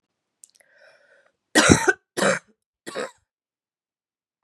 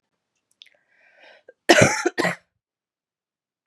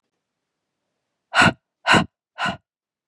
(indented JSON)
{
  "three_cough_length": "4.4 s",
  "three_cough_amplitude": 32768,
  "three_cough_signal_mean_std_ratio": 0.27,
  "cough_length": "3.7 s",
  "cough_amplitude": 32767,
  "cough_signal_mean_std_ratio": 0.26,
  "exhalation_length": "3.1 s",
  "exhalation_amplitude": 25790,
  "exhalation_signal_mean_std_ratio": 0.3,
  "survey_phase": "beta (2021-08-13 to 2022-03-07)",
  "age": "18-44",
  "gender": "Female",
  "wearing_mask": "No",
  "symptom_cough_any": true,
  "symptom_runny_or_blocked_nose": true,
  "symptom_fatigue": true,
  "symptom_headache": true,
  "symptom_change_to_sense_of_smell_or_taste": true,
  "symptom_loss_of_taste": true,
  "smoker_status": "Never smoked",
  "respiratory_condition_asthma": false,
  "respiratory_condition_other": false,
  "recruitment_source": "Test and Trace",
  "submission_delay": "1 day",
  "covid_test_result": "Positive",
  "covid_test_method": "RT-qPCR",
  "covid_ct_value": 19.4,
  "covid_ct_gene": "ORF1ab gene",
  "covid_ct_mean": 19.8,
  "covid_viral_load": "310000 copies/ml",
  "covid_viral_load_category": "Low viral load (10K-1M copies/ml)"
}